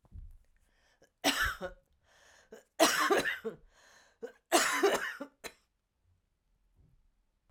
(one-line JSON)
{"three_cough_length": "7.5 s", "three_cough_amplitude": 9526, "three_cough_signal_mean_std_ratio": 0.38, "survey_phase": "alpha (2021-03-01 to 2021-08-12)", "age": "45-64", "gender": "Female", "wearing_mask": "No", "symptom_cough_any": true, "symptom_fatigue": true, "symptom_headache": true, "symptom_change_to_sense_of_smell_or_taste": true, "symptom_onset": "7 days", "smoker_status": "Never smoked", "respiratory_condition_asthma": false, "respiratory_condition_other": false, "recruitment_source": "Test and Trace", "submission_delay": "2 days", "covid_test_result": "Positive", "covid_test_method": "RT-qPCR", "covid_ct_value": 19.3, "covid_ct_gene": "ORF1ab gene", "covid_ct_mean": 20.2, "covid_viral_load": "240000 copies/ml", "covid_viral_load_category": "Low viral load (10K-1M copies/ml)"}